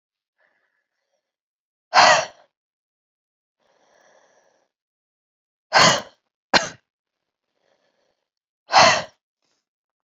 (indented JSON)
{
  "exhalation_length": "10.1 s",
  "exhalation_amplitude": 28501,
  "exhalation_signal_mean_std_ratio": 0.24,
  "survey_phase": "beta (2021-08-13 to 2022-03-07)",
  "age": "45-64",
  "gender": "Female",
  "wearing_mask": "No",
  "symptom_cough_any": true,
  "symptom_shortness_of_breath": true,
  "symptom_fatigue": true,
  "symptom_headache": true,
  "symptom_change_to_sense_of_smell_or_taste": true,
  "symptom_onset": "3 days",
  "smoker_status": "Ex-smoker",
  "respiratory_condition_asthma": false,
  "respiratory_condition_other": false,
  "recruitment_source": "Test and Trace",
  "submission_delay": "2 days",
  "covid_test_result": "Positive",
  "covid_test_method": "RT-qPCR",
  "covid_ct_value": 18.9,
  "covid_ct_gene": "ORF1ab gene",
  "covid_ct_mean": 19.4,
  "covid_viral_load": "440000 copies/ml",
  "covid_viral_load_category": "Low viral load (10K-1M copies/ml)"
}